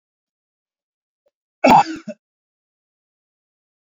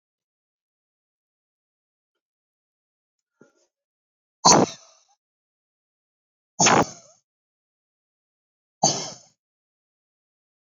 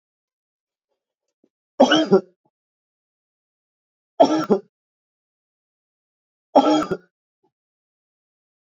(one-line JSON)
{"cough_length": "3.8 s", "cough_amplitude": 30215, "cough_signal_mean_std_ratio": 0.21, "exhalation_length": "10.7 s", "exhalation_amplitude": 30163, "exhalation_signal_mean_std_ratio": 0.19, "three_cough_length": "8.6 s", "three_cough_amplitude": 29120, "three_cough_signal_mean_std_ratio": 0.25, "survey_phase": "beta (2021-08-13 to 2022-03-07)", "age": "45-64", "gender": "Male", "wearing_mask": "No", "symptom_cough_any": true, "symptom_sore_throat": true, "symptom_abdominal_pain": true, "symptom_diarrhoea": true, "symptom_fatigue": true, "symptom_fever_high_temperature": true, "symptom_headache": true, "symptom_onset": "4 days", "smoker_status": "Current smoker (e-cigarettes or vapes only)", "respiratory_condition_asthma": false, "respiratory_condition_other": false, "recruitment_source": "Test and Trace", "submission_delay": "2 days", "covid_test_result": "Positive", "covid_test_method": "RT-qPCR", "covid_ct_value": 15.3, "covid_ct_gene": "ORF1ab gene", "covid_ct_mean": 15.7, "covid_viral_load": "7300000 copies/ml", "covid_viral_load_category": "High viral load (>1M copies/ml)"}